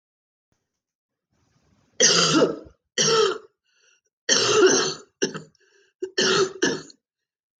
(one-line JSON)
{"three_cough_length": "7.6 s", "three_cough_amplitude": 21734, "three_cough_signal_mean_std_ratio": 0.45, "survey_phase": "beta (2021-08-13 to 2022-03-07)", "age": "65+", "gender": "Female", "wearing_mask": "No", "symptom_cough_any": true, "symptom_runny_or_blocked_nose": true, "symptom_sore_throat": true, "symptom_onset": "7 days", "smoker_status": "Never smoked", "respiratory_condition_asthma": false, "respiratory_condition_other": false, "recruitment_source": "REACT", "submission_delay": "1 day", "covid_test_result": "Negative", "covid_test_method": "RT-qPCR", "influenza_a_test_result": "Negative", "influenza_b_test_result": "Negative"}